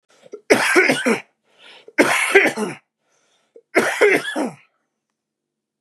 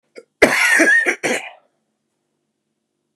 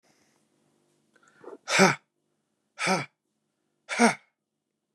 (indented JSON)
{
  "three_cough_length": "5.8 s",
  "three_cough_amplitude": 32767,
  "three_cough_signal_mean_std_ratio": 0.45,
  "cough_length": "3.2 s",
  "cough_amplitude": 32768,
  "cough_signal_mean_std_ratio": 0.44,
  "exhalation_length": "4.9 s",
  "exhalation_amplitude": 17127,
  "exhalation_signal_mean_std_ratio": 0.28,
  "survey_phase": "beta (2021-08-13 to 2022-03-07)",
  "age": "45-64",
  "gender": "Male",
  "wearing_mask": "No",
  "symptom_none": true,
  "smoker_status": "Never smoked",
  "respiratory_condition_asthma": true,
  "respiratory_condition_other": false,
  "recruitment_source": "REACT",
  "submission_delay": "1 day",
  "covid_test_result": "Negative",
  "covid_test_method": "RT-qPCR",
  "influenza_a_test_result": "Negative",
  "influenza_b_test_result": "Negative"
}